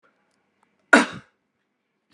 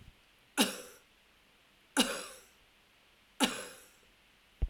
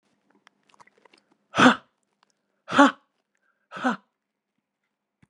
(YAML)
cough_length: 2.1 s
cough_amplitude: 32245
cough_signal_mean_std_ratio: 0.19
three_cough_length: 4.7 s
three_cough_amplitude: 7769
three_cough_signal_mean_std_ratio: 0.31
exhalation_length: 5.3 s
exhalation_amplitude: 29892
exhalation_signal_mean_std_ratio: 0.22
survey_phase: alpha (2021-03-01 to 2021-08-12)
age: 65+
gender: Female
wearing_mask: 'No'
symptom_none: true
smoker_status: Never smoked
respiratory_condition_asthma: false
respiratory_condition_other: false
recruitment_source: REACT
submission_delay: 2 days
covid_test_result: Negative
covid_test_method: RT-qPCR